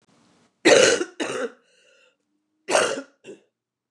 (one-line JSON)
{"cough_length": "3.9 s", "cough_amplitude": 27053, "cough_signal_mean_std_ratio": 0.36, "survey_phase": "beta (2021-08-13 to 2022-03-07)", "age": "45-64", "gender": "Female", "wearing_mask": "No", "symptom_cough_any": true, "symptom_new_continuous_cough": true, "symptom_runny_or_blocked_nose": true, "symptom_sore_throat": true, "symptom_abdominal_pain": true, "symptom_fatigue": true, "symptom_fever_high_temperature": true, "symptom_headache": true, "symptom_change_to_sense_of_smell_or_taste": true, "symptom_onset": "2 days", "smoker_status": "Never smoked", "respiratory_condition_asthma": false, "respiratory_condition_other": false, "recruitment_source": "Test and Trace", "submission_delay": "1 day", "covid_test_result": "Positive", "covid_test_method": "RT-qPCR", "covid_ct_value": 14.8, "covid_ct_gene": "ORF1ab gene", "covid_ct_mean": 15.0, "covid_viral_load": "12000000 copies/ml", "covid_viral_load_category": "High viral load (>1M copies/ml)"}